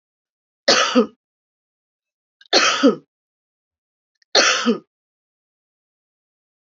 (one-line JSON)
{"three_cough_length": "6.7 s", "three_cough_amplitude": 32768, "three_cough_signal_mean_std_ratio": 0.32, "survey_phase": "beta (2021-08-13 to 2022-03-07)", "age": "45-64", "gender": "Female", "wearing_mask": "No", "symptom_cough_any": true, "symptom_runny_or_blocked_nose": true, "symptom_fever_high_temperature": true, "symptom_other": true, "symptom_onset": "4 days", "smoker_status": "Ex-smoker", "respiratory_condition_asthma": false, "respiratory_condition_other": false, "recruitment_source": "Test and Trace", "submission_delay": "1 day", "covid_test_result": "Positive", "covid_test_method": "RT-qPCR", "covid_ct_value": 22.7, "covid_ct_gene": "ORF1ab gene", "covid_ct_mean": 22.8, "covid_viral_load": "33000 copies/ml", "covid_viral_load_category": "Low viral load (10K-1M copies/ml)"}